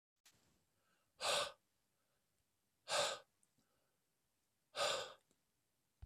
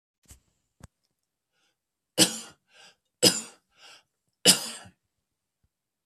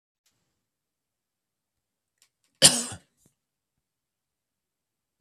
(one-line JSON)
{"exhalation_length": "6.1 s", "exhalation_amplitude": 1576, "exhalation_signal_mean_std_ratio": 0.31, "three_cough_length": "6.1 s", "three_cough_amplitude": 27074, "three_cough_signal_mean_std_ratio": 0.21, "cough_length": "5.2 s", "cough_amplitude": 32768, "cough_signal_mean_std_ratio": 0.13, "survey_phase": "beta (2021-08-13 to 2022-03-07)", "age": "45-64", "gender": "Male", "wearing_mask": "No", "symptom_none": true, "smoker_status": "Never smoked", "respiratory_condition_asthma": false, "respiratory_condition_other": false, "recruitment_source": "Test and Trace", "submission_delay": "2 days", "covid_test_result": "Negative", "covid_test_method": "LFT"}